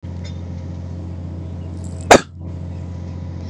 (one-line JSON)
{"cough_length": "3.5 s", "cough_amplitude": 32768, "cough_signal_mean_std_ratio": 0.52, "survey_phase": "beta (2021-08-13 to 2022-03-07)", "age": "18-44", "gender": "Male", "wearing_mask": "No", "symptom_none": true, "smoker_status": "Ex-smoker", "respiratory_condition_asthma": false, "respiratory_condition_other": false, "recruitment_source": "REACT", "submission_delay": "3 days", "covid_test_result": "Negative", "covid_test_method": "RT-qPCR", "influenza_a_test_result": "Negative", "influenza_b_test_result": "Negative"}